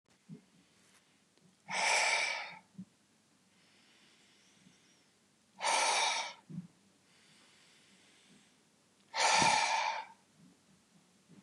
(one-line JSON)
{"exhalation_length": "11.4 s", "exhalation_amplitude": 5377, "exhalation_signal_mean_std_ratio": 0.4, "survey_phase": "beta (2021-08-13 to 2022-03-07)", "age": "45-64", "gender": "Male", "wearing_mask": "No", "symptom_none": true, "smoker_status": "Ex-smoker", "respiratory_condition_asthma": false, "respiratory_condition_other": false, "recruitment_source": "REACT", "submission_delay": "3 days", "covid_test_result": "Negative", "covid_test_method": "RT-qPCR", "influenza_a_test_result": "Negative", "influenza_b_test_result": "Negative"}